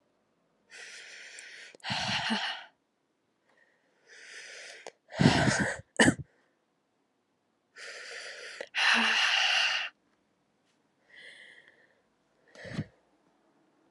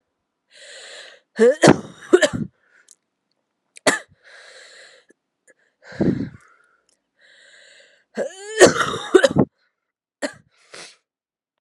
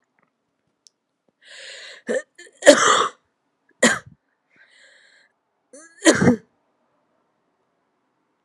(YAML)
exhalation_length: 13.9 s
exhalation_amplitude: 15392
exhalation_signal_mean_std_ratio: 0.38
cough_length: 11.6 s
cough_amplitude: 32768
cough_signal_mean_std_ratio: 0.28
three_cough_length: 8.4 s
three_cough_amplitude: 32768
three_cough_signal_mean_std_ratio: 0.26
survey_phase: alpha (2021-03-01 to 2021-08-12)
age: 18-44
gender: Female
wearing_mask: 'No'
symptom_cough_any: true
smoker_status: Current smoker (1 to 10 cigarettes per day)
respiratory_condition_asthma: false
respiratory_condition_other: false
recruitment_source: Test and Trace
submission_delay: 1 day
covid_test_result: Positive
covid_test_method: RT-qPCR